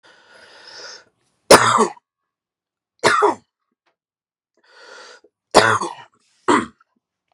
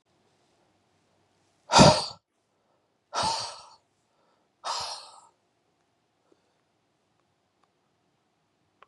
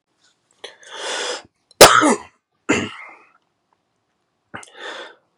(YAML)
three_cough_length: 7.3 s
three_cough_amplitude: 32768
three_cough_signal_mean_std_ratio: 0.3
exhalation_length: 8.9 s
exhalation_amplitude: 22421
exhalation_signal_mean_std_ratio: 0.2
cough_length: 5.4 s
cough_amplitude: 32768
cough_signal_mean_std_ratio: 0.27
survey_phase: beta (2021-08-13 to 2022-03-07)
age: 18-44
gender: Male
wearing_mask: 'No'
symptom_cough_any: true
symptom_new_continuous_cough: true
symptom_runny_or_blocked_nose: true
symptom_fatigue: true
symptom_headache: true
symptom_onset: 3 days
smoker_status: Never smoked
respiratory_condition_asthma: false
respiratory_condition_other: false
recruitment_source: REACT
submission_delay: 2 days
covid_test_result: Positive
covid_test_method: RT-qPCR
covid_ct_value: 20.0
covid_ct_gene: E gene
influenza_a_test_result: Negative
influenza_b_test_result: Negative